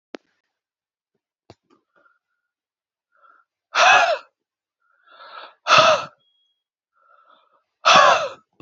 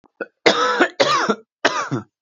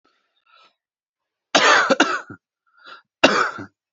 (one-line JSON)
{"exhalation_length": "8.6 s", "exhalation_amplitude": 32633, "exhalation_signal_mean_std_ratio": 0.3, "three_cough_length": "2.2 s", "three_cough_amplitude": 29481, "three_cough_signal_mean_std_ratio": 0.58, "cough_length": "3.9 s", "cough_amplitude": 29708, "cough_signal_mean_std_ratio": 0.37, "survey_phase": "beta (2021-08-13 to 2022-03-07)", "age": "18-44", "gender": "Male", "wearing_mask": "No", "symptom_none": true, "symptom_onset": "12 days", "smoker_status": "Current smoker (1 to 10 cigarettes per day)", "respiratory_condition_asthma": true, "respiratory_condition_other": false, "recruitment_source": "REACT", "submission_delay": "1 day", "covid_test_result": "Negative", "covid_test_method": "RT-qPCR"}